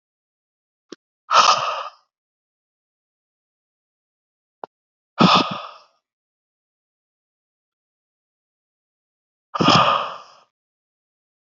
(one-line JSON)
{"exhalation_length": "11.4 s", "exhalation_amplitude": 29059, "exhalation_signal_mean_std_ratio": 0.26, "survey_phase": "beta (2021-08-13 to 2022-03-07)", "age": "18-44", "gender": "Male", "wearing_mask": "No", "symptom_cough_any": true, "symptom_new_continuous_cough": true, "symptom_runny_or_blocked_nose": true, "symptom_sore_throat": true, "symptom_fatigue": true, "symptom_change_to_sense_of_smell_or_taste": true, "symptom_onset": "2 days", "smoker_status": "Never smoked", "respiratory_condition_asthma": false, "respiratory_condition_other": false, "recruitment_source": "Test and Trace", "submission_delay": "1 day", "covid_test_result": "Positive", "covid_test_method": "RT-qPCR", "covid_ct_value": 24.2, "covid_ct_gene": "ORF1ab gene"}